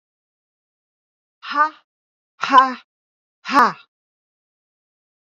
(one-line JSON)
{"exhalation_length": "5.4 s", "exhalation_amplitude": 27983, "exhalation_signal_mean_std_ratio": 0.25, "survey_phase": "beta (2021-08-13 to 2022-03-07)", "age": "45-64", "gender": "Female", "wearing_mask": "No", "symptom_none": true, "smoker_status": "Never smoked", "respiratory_condition_asthma": false, "respiratory_condition_other": false, "recruitment_source": "REACT", "submission_delay": "1 day", "covid_test_result": "Negative", "covid_test_method": "RT-qPCR", "influenza_a_test_result": "Negative", "influenza_b_test_result": "Negative"}